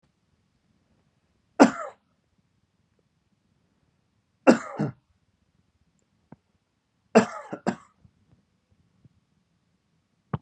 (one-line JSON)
{"three_cough_length": "10.4 s", "three_cough_amplitude": 30823, "three_cough_signal_mean_std_ratio": 0.17, "survey_phase": "beta (2021-08-13 to 2022-03-07)", "age": "18-44", "gender": "Male", "wearing_mask": "No", "symptom_headache": true, "symptom_onset": "4 days", "smoker_status": "Never smoked", "respiratory_condition_asthma": false, "respiratory_condition_other": false, "recruitment_source": "REACT", "submission_delay": "4 days", "covid_test_result": "Negative", "covid_test_method": "RT-qPCR", "influenza_a_test_result": "Negative", "influenza_b_test_result": "Negative"}